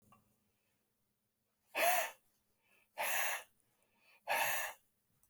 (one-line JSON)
{"exhalation_length": "5.3 s", "exhalation_amplitude": 3358, "exhalation_signal_mean_std_ratio": 0.39, "survey_phase": "beta (2021-08-13 to 2022-03-07)", "age": "65+", "gender": "Male", "wearing_mask": "No", "symptom_cough_any": true, "symptom_runny_or_blocked_nose": true, "symptom_sore_throat": true, "smoker_status": "Ex-smoker", "respiratory_condition_asthma": false, "respiratory_condition_other": false, "recruitment_source": "Test and Trace", "submission_delay": "2 days", "covid_test_result": "Positive", "covid_test_method": "ePCR"}